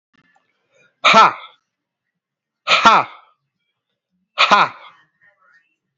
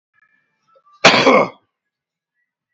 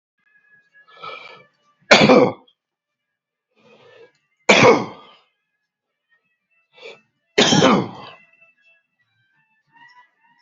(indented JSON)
{
  "exhalation_length": "6.0 s",
  "exhalation_amplitude": 32767,
  "exhalation_signal_mean_std_ratio": 0.31,
  "cough_length": "2.7 s",
  "cough_amplitude": 32768,
  "cough_signal_mean_std_ratio": 0.32,
  "three_cough_length": "10.4 s",
  "three_cough_amplitude": 32767,
  "three_cough_signal_mean_std_ratio": 0.28,
  "survey_phase": "beta (2021-08-13 to 2022-03-07)",
  "age": "45-64",
  "gender": "Male",
  "wearing_mask": "No",
  "symptom_none": true,
  "smoker_status": "Ex-smoker",
  "respiratory_condition_asthma": false,
  "respiratory_condition_other": false,
  "recruitment_source": "REACT",
  "submission_delay": "12 days",
  "covid_test_result": "Negative",
  "covid_test_method": "RT-qPCR",
  "influenza_a_test_result": "Negative",
  "influenza_b_test_result": "Negative"
}